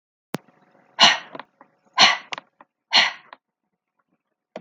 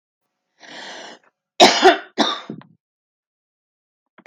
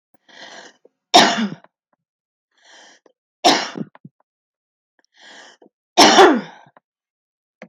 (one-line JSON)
{"exhalation_length": "4.6 s", "exhalation_amplitude": 32768, "exhalation_signal_mean_std_ratio": 0.28, "cough_length": "4.3 s", "cough_amplitude": 32768, "cough_signal_mean_std_ratio": 0.27, "three_cough_length": "7.7 s", "three_cough_amplitude": 32768, "three_cough_signal_mean_std_ratio": 0.28, "survey_phase": "beta (2021-08-13 to 2022-03-07)", "age": "18-44", "gender": "Female", "wearing_mask": "No", "symptom_none": true, "smoker_status": "Ex-smoker", "respiratory_condition_asthma": false, "respiratory_condition_other": false, "recruitment_source": "REACT", "submission_delay": "3 days", "covid_test_result": "Negative", "covid_test_method": "RT-qPCR", "influenza_a_test_result": "Negative", "influenza_b_test_result": "Negative"}